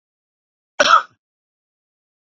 {
  "cough_length": "2.3 s",
  "cough_amplitude": 32767,
  "cough_signal_mean_std_ratio": 0.23,
  "survey_phase": "beta (2021-08-13 to 2022-03-07)",
  "age": "45-64",
  "gender": "Male",
  "wearing_mask": "No",
  "symptom_cough_any": true,
  "symptom_runny_or_blocked_nose": true,
  "symptom_sore_throat": true,
  "symptom_headache": true,
  "symptom_onset": "3 days",
  "smoker_status": "Never smoked",
  "respiratory_condition_asthma": false,
  "respiratory_condition_other": false,
  "recruitment_source": "Test and Trace",
  "submission_delay": "2 days",
  "covid_test_result": "Positive",
  "covid_test_method": "RT-qPCR",
  "covid_ct_value": 24.5,
  "covid_ct_gene": "N gene",
  "covid_ct_mean": 24.6,
  "covid_viral_load": "8500 copies/ml",
  "covid_viral_load_category": "Minimal viral load (< 10K copies/ml)"
}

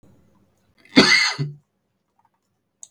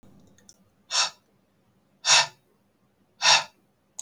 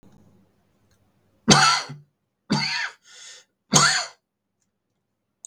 {
  "cough_length": "2.9 s",
  "cough_amplitude": 32768,
  "cough_signal_mean_std_ratio": 0.31,
  "exhalation_length": "4.0 s",
  "exhalation_amplitude": 20628,
  "exhalation_signal_mean_std_ratio": 0.3,
  "three_cough_length": "5.5 s",
  "three_cough_amplitude": 32768,
  "three_cough_signal_mean_std_ratio": 0.33,
  "survey_phase": "beta (2021-08-13 to 2022-03-07)",
  "age": "18-44",
  "gender": "Male",
  "wearing_mask": "No",
  "symptom_cough_any": true,
  "symptom_sore_throat": true,
  "symptom_fatigue": true,
  "symptom_onset": "4 days",
  "smoker_status": "Never smoked",
  "respiratory_condition_asthma": false,
  "respiratory_condition_other": false,
  "recruitment_source": "Test and Trace",
  "submission_delay": "2 days",
  "covid_test_result": "Positive",
  "covid_test_method": "RT-qPCR",
  "covid_ct_value": 18.0,
  "covid_ct_gene": "ORF1ab gene"
}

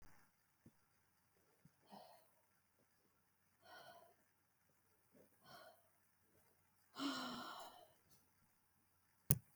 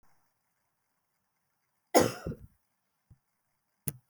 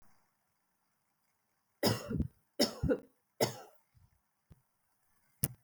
{
  "exhalation_length": "9.6 s",
  "exhalation_amplitude": 10090,
  "exhalation_signal_mean_std_ratio": 0.23,
  "cough_length": "4.1 s",
  "cough_amplitude": 14423,
  "cough_signal_mean_std_ratio": 0.19,
  "three_cough_length": "5.6 s",
  "three_cough_amplitude": 13520,
  "three_cough_signal_mean_std_ratio": 0.29,
  "survey_phase": "beta (2021-08-13 to 2022-03-07)",
  "age": "45-64",
  "gender": "Female",
  "wearing_mask": "No",
  "symptom_none": true,
  "smoker_status": "Never smoked",
  "respiratory_condition_asthma": false,
  "respiratory_condition_other": false,
  "recruitment_source": "Test and Trace",
  "submission_delay": "1 day",
  "covid_test_result": "Positive",
  "covid_test_method": "RT-qPCR",
  "covid_ct_value": 26.6,
  "covid_ct_gene": "ORF1ab gene"
}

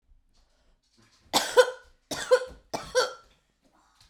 {
  "three_cough_length": "4.1 s",
  "three_cough_amplitude": 16772,
  "three_cough_signal_mean_std_ratio": 0.3,
  "survey_phase": "beta (2021-08-13 to 2022-03-07)",
  "age": "18-44",
  "gender": "Female",
  "wearing_mask": "Yes",
  "symptom_runny_or_blocked_nose": true,
  "symptom_sore_throat": true,
  "symptom_diarrhoea": true,
  "symptom_fever_high_temperature": true,
  "symptom_headache": true,
  "symptom_onset": "2 days",
  "smoker_status": "Current smoker (11 or more cigarettes per day)",
  "respiratory_condition_asthma": false,
  "respiratory_condition_other": false,
  "recruitment_source": "Test and Trace",
  "submission_delay": "2 days",
  "covid_test_result": "Positive",
  "covid_test_method": "ePCR"
}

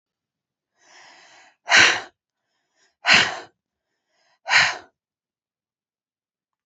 {
  "exhalation_length": "6.7 s",
  "exhalation_amplitude": 31945,
  "exhalation_signal_mean_std_ratio": 0.27,
  "survey_phase": "beta (2021-08-13 to 2022-03-07)",
  "age": "45-64",
  "gender": "Female",
  "wearing_mask": "No",
  "symptom_cough_any": true,
  "symptom_new_continuous_cough": true,
  "symptom_runny_or_blocked_nose": true,
  "symptom_shortness_of_breath": true,
  "symptom_sore_throat": true,
  "symptom_fatigue": true,
  "symptom_headache": true,
  "symptom_onset": "2 days",
  "smoker_status": "Ex-smoker",
  "respiratory_condition_asthma": false,
  "respiratory_condition_other": false,
  "recruitment_source": "Test and Trace",
  "submission_delay": "1 day",
  "covid_test_result": "Positive",
  "covid_test_method": "RT-qPCR",
  "covid_ct_value": 21.5,
  "covid_ct_gene": "ORF1ab gene",
  "covid_ct_mean": 22.2,
  "covid_viral_load": "53000 copies/ml",
  "covid_viral_load_category": "Low viral load (10K-1M copies/ml)"
}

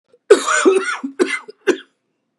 {
  "cough_length": "2.4 s",
  "cough_amplitude": 32768,
  "cough_signal_mean_std_ratio": 0.46,
  "survey_phase": "beta (2021-08-13 to 2022-03-07)",
  "age": "45-64",
  "gender": "Male",
  "wearing_mask": "No",
  "symptom_cough_any": true,
  "symptom_runny_or_blocked_nose": true,
  "symptom_sore_throat": true,
  "symptom_fatigue": true,
  "symptom_other": true,
  "symptom_onset": "4 days",
  "smoker_status": "Never smoked",
  "respiratory_condition_asthma": false,
  "respiratory_condition_other": false,
  "recruitment_source": "Test and Trace",
  "submission_delay": "2 days",
  "covid_test_result": "Positive",
  "covid_test_method": "RT-qPCR",
  "covid_ct_value": 18.1,
  "covid_ct_gene": "ORF1ab gene",
  "covid_ct_mean": 18.2,
  "covid_viral_load": "1000000 copies/ml",
  "covid_viral_load_category": "High viral load (>1M copies/ml)"
}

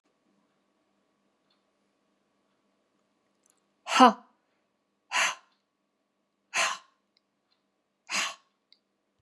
{
  "exhalation_length": "9.2 s",
  "exhalation_amplitude": 25550,
  "exhalation_signal_mean_std_ratio": 0.19,
  "survey_phase": "beta (2021-08-13 to 2022-03-07)",
  "age": "65+",
  "gender": "Female",
  "wearing_mask": "No",
  "symptom_none": true,
  "smoker_status": "Never smoked",
  "respiratory_condition_asthma": true,
  "respiratory_condition_other": false,
  "recruitment_source": "REACT",
  "submission_delay": "1 day",
  "covid_test_result": "Negative",
  "covid_test_method": "RT-qPCR",
  "influenza_a_test_result": "Negative",
  "influenza_b_test_result": "Negative"
}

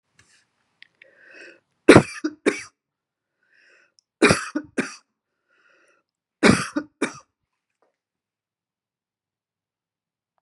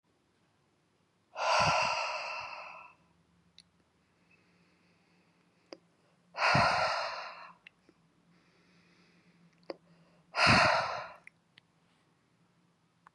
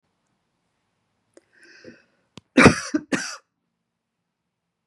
{
  "three_cough_length": "10.4 s",
  "three_cough_amplitude": 32768,
  "three_cough_signal_mean_std_ratio": 0.2,
  "exhalation_length": "13.1 s",
  "exhalation_amplitude": 9572,
  "exhalation_signal_mean_std_ratio": 0.36,
  "cough_length": "4.9 s",
  "cough_amplitude": 32768,
  "cough_signal_mean_std_ratio": 0.2,
  "survey_phase": "beta (2021-08-13 to 2022-03-07)",
  "age": "45-64",
  "gender": "Female",
  "wearing_mask": "No",
  "symptom_headache": true,
  "smoker_status": "Never smoked",
  "respiratory_condition_asthma": false,
  "respiratory_condition_other": false,
  "recruitment_source": "REACT",
  "submission_delay": "0 days",
  "covid_test_result": "Negative",
  "covid_test_method": "RT-qPCR",
  "influenza_a_test_result": "Negative",
  "influenza_b_test_result": "Negative"
}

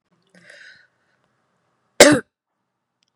{
  "cough_length": "3.2 s",
  "cough_amplitude": 32768,
  "cough_signal_mean_std_ratio": 0.19,
  "survey_phase": "beta (2021-08-13 to 2022-03-07)",
  "age": "45-64",
  "gender": "Female",
  "wearing_mask": "No",
  "symptom_runny_or_blocked_nose": true,
  "symptom_sore_throat": true,
  "symptom_fatigue": true,
  "symptom_onset": "13 days",
  "smoker_status": "Never smoked",
  "respiratory_condition_asthma": false,
  "respiratory_condition_other": false,
  "recruitment_source": "REACT",
  "submission_delay": "2 days",
  "covid_test_result": "Negative",
  "covid_test_method": "RT-qPCR"
}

